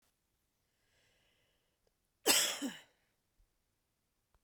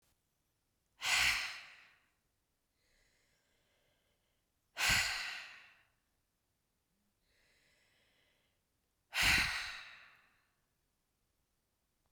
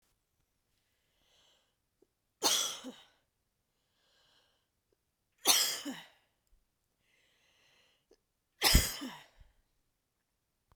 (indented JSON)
{
  "cough_length": "4.4 s",
  "cough_amplitude": 6509,
  "cough_signal_mean_std_ratio": 0.23,
  "exhalation_length": "12.1 s",
  "exhalation_amplitude": 4397,
  "exhalation_signal_mean_std_ratio": 0.3,
  "three_cough_length": "10.8 s",
  "three_cough_amplitude": 9374,
  "three_cough_signal_mean_std_ratio": 0.24,
  "survey_phase": "beta (2021-08-13 to 2022-03-07)",
  "age": "45-64",
  "gender": "Female",
  "wearing_mask": "No",
  "symptom_sore_throat": true,
  "smoker_status": "Ex-smoker",
  "respiratory_condition_asthma": true,
  "respiratory_condition_other": false,
  "recruitment_source": "REACT",
  "submission_delay": "1 day",
  "covid_test_result": "Negative",
  "covid_test_method": "RT-qPCR",
  "influenza_a_test_result": "Negative",
  "influenza_b_test_result": "Negative"
}